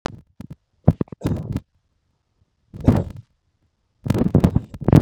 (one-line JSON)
{"three_cough_length": "5.0 s", "three_cough_amplitude": 32766, "three_cough_signal_mean_std_ratio": 0.32, "survey_phase": "beta (2021-08-13 to 2022-03-07)", "age": "18-44", "gender": "Male", "wearing_mask": "No", "symptom_none": true, "smoker_status": "Ex-smoker", "respiratory_condition_asthma": false, "respiratory_condition_other": false, "recruitment_source": "REACT", "submission_delay": "2 days", "covid_test_result": "Negative", "covid_test_method": "RT-qPCR", "influenza_a_test_result": "Negative", "influenza_b_test_result": "Negative"}